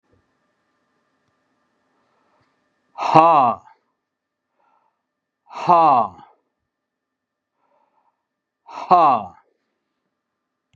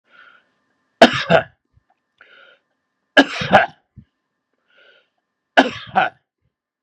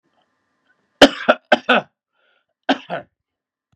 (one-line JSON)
{"exhalation_length": "10.8 s", "exhalation_amplitude": 32768, "exhalation_signal_mean_std_ratio": 0.27, "three_cough_length": "6.8 s", "three_cough_amplitude": 32768, "three_cough_signal_mean_std_ratio": 0.26, "cough_length": "3.8 s", "cough_amplitude": 32768, "cough_signal_mean_std_ratio": 0.24, "survey_phase": "beta (2021-08-13 to 2022-03-07)", "age": "65+", "gender": "Male", "wearing_mask": "No", "symptom_none": true, "smoker_status": "Ex-smoker", "respiratory_condition_asthma": false, "respiratory_condition_other": false, "recruitment_source": "REACT", "submission_delay": "2 days", "covid_test_result": "Negative", "covid_test_method": "RT-qPCR", "influenza_a_test_result": "Negative", "influenza_b_test_result": "Negative"}